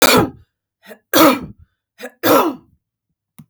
{"three_cough_length": "3.5 s", "three_cough_amplitude": 32766, "three_cough_signal_mean_std_ratio": 0.41, "survey_phase": "beta (2021-08-13 to 2022-03-07)", "age": "45-64", "gender": "Female", "wearing_mask": "No", "symptom_cough_any": true, "symptom_onset": "12 days", "smoker_status": "Never smoked", "respiratory_condition_asthma": false, "respiratory_condition_other": false, "recruitment_source": "REACT", "submission_delay": "3 days", "covid_test_result": "Negative", "covid_test_method": "RT-qPCR", "influenza_a_test_result": "Negative", "influenza_b_test_result": "Negative"}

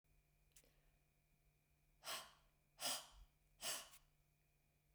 {"exhalation_length": "4.9 s", "exhalation_amplitude": 888, "exhalation_signal_mean_std_ratio": 0.35, "survey_phase": "beta (2021-08-13 to 2022-03-07)", "age": "65+", "gender": "Female", "wearing_mask": "No", "symptom_none": true, "smoker_status": "Never smoked", "respiratory_condition_asthma": false, "respiratory_condition_other": false, "recruitment_source": "REACT", "submission_delay": "1 day", "covid_test_result": "Negative", "covid_test_method": "RT-qPCR", "influenza_a_test_result": "Negative", "influenza_b_test_result": "Negative"}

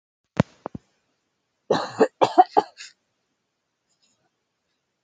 {"cough_length": "5.0 s", "cough_amplitude": 27341, "cough_signal_mean_std_ratio": 0.22, "survey_phase": "beta (2021-08-13 to 2022-03-07)", "age": "18-44", "gender": "Female", "wearing_mask": "No", "symptom_runny_or_blocked_nose": true, "symptom_fatigue": true, "smoker_status": "Never smoked", "respiratory_condition_asthma": false, "respiratory_condition_other": false, "recruitment_source": "Test and Trace", "submission_delay": "2 days", "covid_test_result": "Positive", "covid_test_method": "ePCR"}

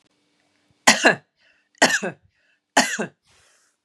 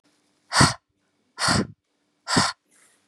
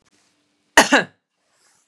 {"three_cough_length": "3.8 s", "three_cough_amplitude": 32767, "three_cough_signal_mean_std_ratio": 0.3, "exhalation_length": "3.1 s", "exhalation_amplitude": 27379, "exhalation_signal_mean_std_ratio": 0.36, "cough_length": "1.9 s", "cough_amplitude": 32768, "cough_signal_mean_std_ratio": 0.24, "survey_phase": "beta (2021-08-13 to 2022-03-07)", "age": "18-44", "gender": "Female", "wearing_mask": "No", "symptom_none": true, "smoker_status": "Never smoked", "respiratory_condition_asthma": false, "respiratory_condition_other": false, "recruitment_source": "REACT", "submission_delay": "1 day", "covid_test_result": "Negative", "covid_test_method": "RT-qPCR", "influenza_a_test_result": "Negative", "influenza_b_test_result": "Negative"}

